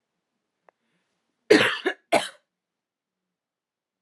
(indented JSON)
{
  "cough_length": "4.0 s",
  "cough_amplitude": 24650,
  "cough_signal_mean_std_ratio": 0.24,
  "survey_phase": "beta (2021-08-13 to 2022-03-07)",
  "age": "18-44",
  "gender": "Female",
  "wearing_mask": "No",
  "symptom_fatigue": true,
  "symptom_fever_high_temperature": true,
  "symptom_headache": true,
  "symptom_onset": "3 days",
  "smoker_status": "Never smoked",
  "respiratory_condition_asthma": false,
  "respiratory_condition_other": false,
  "recruitment_source": "Test and Trace",
  "submission_delay": "2 days",
  "covid_test_result": "Positive",
  "covid_test_method": "RT-qPCR",
  "covid_ct_value": 28.9,
  "covid_ct_gene": "N gene"
}